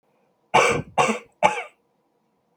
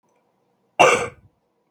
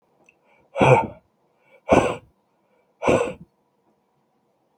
{
  "three_cough_length": "2.6 s",
  "three_cough_amplitude": 30495,
  "three_cough_signal_mean_std_ratio": 0.38,
  "cough_length": "1.7 s",
  "cough_amplitude": 32509,
  "cough_signal_mean_std_ratio": 0.3,
  "exhalation_length": "4.8 s",
  "exhalation_amplitude": 25874,
  "exhalation_signal_mean_std_ratio": 0.31,
  "survey_phase": "beta (2021-08-13 to 2022-03-07)",
  "age": "45-64",
  "gender": "Male",
  "wearing_mask": "No",
  "symptom_none": true,
  "smoker_status": "Never smoked",
  "respiratory_condition_asthma": false,
  "respiratory_condition_other": false,
  "recruitment_source": "REACT",
  "submission_delay": "0 days",
  "covid_test_result": "Negative",
  "covid_test_method": "RT-qPCR"
}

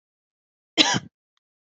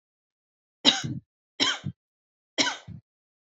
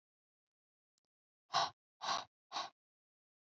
{
  "cough_length": "1.8 s",
  "cough_amplitude": 27672,
  "cough_signal_mean_std_ratio": 0.25,
  "three_cough_length": "3.4 s",
  "three_cough_amplitude": 25064,
  "three_cough_signal_mean_std_ratio": 0.32,
  "exhalation_length": "3.6 s",
  "exhalation_amplitude": 2570,
  "exhalation_signal_mean_std_ratio": 0.27,
  "survey_phase": "beta (2021-08-13 to 2022-03-07)",
  "age": "18-44",
  "gender": "Female",
  "wearing_mask": "No",
  "symptom_none": true,
  "smoker_status": "Never smoked",
  "respiratory_condition_asthma": false,
  "respiratory_condition_other": false,
  "recruitment_source": "REACT",
  "submission_delay": "4 days",
  "covid_test_result": "Negative",
  "covid_test_method": "RT-qPCR",
  "influenza_a_test_result": "Negative",
  "influenza_b_test_result": "Negative"
}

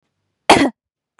{
  "cough_length": "1.2 s",
  "cough_amplitude": 32768,
  "cough_signal_mean_std_ratio": 0.31,
  "survey_phase": "beta (2021-08-13 to 2022-03-07)",
  "age": "18-44",
  "gender": "Female",
  "wearing_mask": "No",
  "symptom_fatigue": true,
  "symptom_headache": true,
  "smoker_status": "Never smoked",
  "respiratory_condition_asthma": false,
  "respiratory_condition_other": false,
  "recruitment_source": "REACT",
  "submission_delay": "1 day",
  "covid_test_result": "Negative",
  "covid_test_method": "RT-qPCR",
  "influenza_a_test_result": "Negative",
  "influenza_b_test_result": "Negative"
}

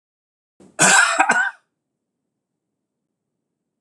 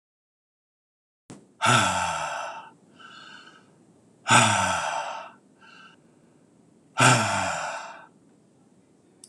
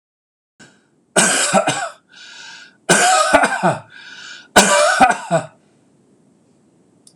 {
  "cough_length": "3.8 s",
  "cough_amplitude": 26028,
  "cough_signal_mean_std_ratio": 0.33,
  "exhalation_length": "9.3 s",
  "exhalation_amplitude": 22732,
  "exhalation_signal_mean_std_ratio": 0.41,
  "three_cough_length": "7.2 s",
  "three_cough_amplitude": 26028,
  "three_cough_signal_mean_std_ratio": 0.48,
  "survey_phase": "beta (2021-08-13 to 2022-03-07)",
  "age": "45-64",
  "gender": "Male",
  "wearing_mask": "No",
  "symptom_none": true,
  "smoker_status": "Never smoked",
  "respiratory_condition_asthma": false,
  "respiratory_condition_other": false,
  "recruitment_source": "REACT",
  "submission_delay": "1 day",
  "covid_test_result": "Negative",
  "covid_test_method": "RT-qPCR"
}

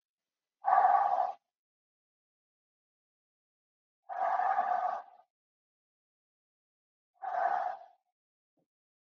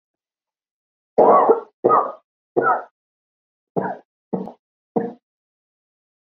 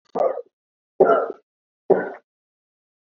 {
  "exhalation_length": "9.0 s",
  "exhalation_amplitude": 8196,
  "exhalation_signal_mean_std_ratio": 0.37,
  "three_cough_length": "6.3 s",
  "three_cough_amplitude": 30014,
  "three_cough_signal_mean_std_ratio": 0.34,
  "cough_length": "3.1 s",
  "cough_amplitude": 26933,
  "cough_signal_mean_std_ratio": 0.35,
  "survey_phase": "beta (2021-08-13 to 2022-03-07)",
  "age": "18-44",
  "gender": "Female",
  "wearing_mask": "No",
  "symptom_new_continuous_cough": true,
  "symptom_sore_throat": true,
  "symptom_onset": "7 days",
  "smoker_status": "Never smoked",
  "respiratory_condition_asthma": false,
  "respiratory_condition_other": false,
  "recruitment_source": "Test and Trace",
  "submission_delay": "2 days",
  "covid_test_result": "Positive",
  "covid_test_method": "ePCR"
}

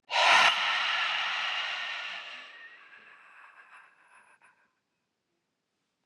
{
  "exhalation_length": "6.1 s",
  "exhalation_amplitude": 13570,
  "exhalation_signal_mean_std_ratio": 0.46,
  "survey_phase": "beta (2021-08-13 to 2022-03-07)",
  "age": "18-44",
  "gender": "Female",
  "wearing_mask": "No",
  "symptom_cough_any": true,
  "symptom_runny_or_blocked_nose": true,
  "symptom_shortness_of_breath": true,
  "symptom_fatigue": true,
  "symptom_headache": true,
  "symptom_onset": "2 days",
  "smoker_status": "Never smoked",
  "respiratory_condition_asthma": false,
  "respiratory_condition_other": false,
  "recruitment_source": "Test and Trace",
  "submission_delay": "1 day",
  "covid_test_result": "Positive",
  "covid_test_method": "RT-qPCR",
  "covid_ct_value": 16.4,
  "covid_ct_gene": "ORF1ab gene",
  "covid_ct_mean": 16.9,
  "covid_viral_load": "2900000 copies/ml",
  "covid_viral_load_category": "High viral load (>1M copies/ml)"
}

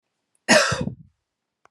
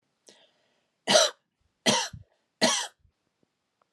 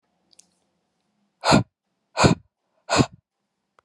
{
  "cough_length": "1.7 s",
  "cough_amplitude": 28097,
  "cough_signal_mean_std_ratio": 0.35,
  "three_cough_length": "3.9 s",
  "three_cough_amplitude": 16518,
  "three_cough_signal_mean_std_ratio": 0.31,
  "exhalation_length": "3.8 s",
  "exhalation_amplitude": 26502,
  "exhalation_signal_mean_std_ratio": 0.28,
  "survey_phase": "alpha (2021-03-01 to 2021-08-12)",
  "age": "45-64",
  "gender": "Female",
  "wearing_mask": "No",
  "symptom_none": true,
  "smoker_status": "Never smoked",
  "respiratory_condition_asthma": false,
  "respiratory_condition_other": false,
  "recruitment_source": "REACT",
  "submission_delay": "2 days",
  "covid_test_result": "Negative",
  "covid_test_method": "RT-qPCR"
}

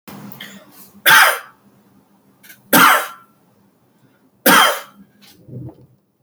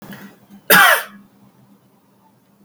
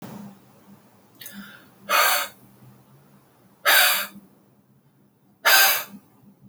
{
  "three_cough_length": "6.2 s",
  "three_cough_amplitude": 32768,
  "three_cough_signal_mean_std_ratio": 0.35,
  "cough_length": "2.6 s",
  "cough_amplitude": 32768,
  "cough_signal_mean_std_ratio": 0.31,
  "exhalation_length": "6.5 s",
  "exhalation_amplitude": 24751,
  "exhalation_signal_mean_std_ratio": 0.37,
  "survey_phase": "alpha (2021-03-01 to 2021-08-12)",
  "age": "18-44",
  "gender": "Male",
  "wearing_mask": "No",
  "symptom_none": true,
  "smoker_status": "Ex-smoker",
  "respiratory_condition_asthma": false,
  "respiratory_condition_other": false,
  "recruitment_source": "REACT",
  "submission_delay": "4 days",
  "covid_test_result": "Negative",
  "covid_test_method": "RT-qPCR"
}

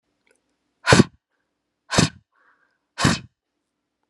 {
  "exhalation_length": "4.1 s",
  "exhalation_amplitude": 32767,
  "exhalation_signal_mean_std_ratio": 0.25,
  "survey_phase": "beta (2021-08-13 to 2022-03-07)",
  "age": "45-64",
  "gender": "Male",
  "wearing_mask": "No",
  "symptom_none": true,
  "symptom_onset": "2 days",
  "smoker_status": "Never smoked",
  "respiratory_condition_asthma": false,
  "respiratory_condition_other": false,
  "recruitment_source": "Test and Trace",
  "submission_delay": "1 day",
  "covid_test_result": "Positive",
  "covid_test_method": "ePCR"
}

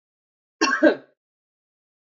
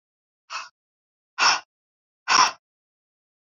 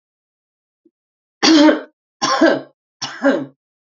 {
  "cough_length": "2.0 s",
  "cough_amplitude": 20197,
  "cough_signal_mean_std_ratio": 0.29,
  "exhalation_length": "3.5 s",
  "exhalation_amplitude": 22885,
  "exhalation_signal_mean_std_ratio": 0.28,
  "three_cough_length": "3.9 s",
  "three_cough_amplitude": 32768,
  "three_cough_signal_mean_std_ratio": 0.41,
  "survey_phase": "beta (2021-08-13 to 2022-03-07)",
  "age": "45-64",
  "gender": "Female",
  "wearing_mask": "No",
  "symptom_fatigue": true,
  "symptom_headache": true,
  "smoker_status": "Never smoked",
  "respiratory_condition_asthma": false,
  "respiratory_condition_other": false,
  "recruitment_source": "REACT",
  "submission_delay": "4 days",
  "covid_test_result": "Negative",
  "covid_test_method": "RT-qPCR",
  "influenza_a_test_result": "Negative",
  "influenza_b_test_result": "Negative"
}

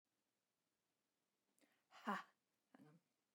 {
  "exhalation_length": "3.3 s",
  "exhalation_amplitude": 967,
  "exhalation_signal_mean_std_ratio": 0.21,
  "survey_phase": "beta (2021-08-13 to 2022-03-07)",
  "age": "45-64",
  "gender": "Female",
  "wearing_mask": "No",
  "symptom_runny_or_blocked_nose": true,
  "smoker_status": "Never smoked",
  "respiratory_condition_asthma": false,
  "respiratory_condition_other": false,
  "recruitment_source": "REACT",
  "submission_delay": "2 days",
  "covid_test_result": "Negative",
  "covid_test_method": "RT-qPCR",
  "influenza_a_test_result": "Negative",
  "influenza_b_test_result": "Negative"
}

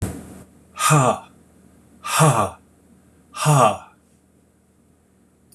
{
  "exhalation_length": "5.5 s",
  "exhalation_amplitude": 24671,
  "exhalation_signal_mean_std_ratio": 0.4,
  "survey_phase": "beta (2021-08-13 to 2022-03-07)",
  "age": "65+",
  "gender": "Male",
  "wearing_mask": "No",
  "symptom_cough_any": true,
  "symptom_runny_or_blocked_nose": true,
  "smoker_status": "Never smoked",
  "respiratory_condition_asthma": false,
  "respiratory_condition_other": false,
  "recruitment_source": "REACT",
  "submission_delay": "1 day",
  "covid_test_result": "Negative",
  "covid_test_method": "RT-qPCR"
}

